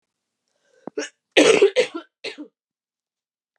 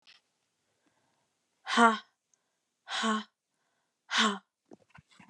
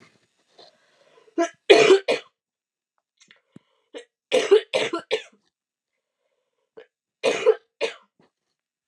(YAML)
cough_length: 3.6 s
cough_amplitude: 31270
cough_signal_mean_std_ratio: 0.3
exhalation_length: 5.3 s
exhalation_amplitude: 14199
exhalation_signal_mean_std_ratio: 0.29
three_cough_length: 8.9 s
three_cough_amplitude: 32715
three_cough_signal_mean_std_ratio: 0.29
survey_phase: beta (2021-08-13 to 2022-03-07)
age: 18-44
gender: Female
wearing_mask: 'No'
symptom_runny_or_blocked_nose: true
symptom_change_to_sense_of_smell_or_taste: true
symptom_onset: 5 days
smoker_status: Never smoked
respiratory_condition_asthma: false
respiratory_condition_other: false
recruitment_source: Test and Trace
submission_delay: 1 day
covid_test_result: Positive
covid_test_method: RT-qPCR
covid_ct_value: 15.8
covid_ct_gene: ORF1ab gene
covid_ct_mean: 16.2
covid_viral_load: 4800000 copies/ml
covid_viral_load_category: High viral load (>1M copies/ml)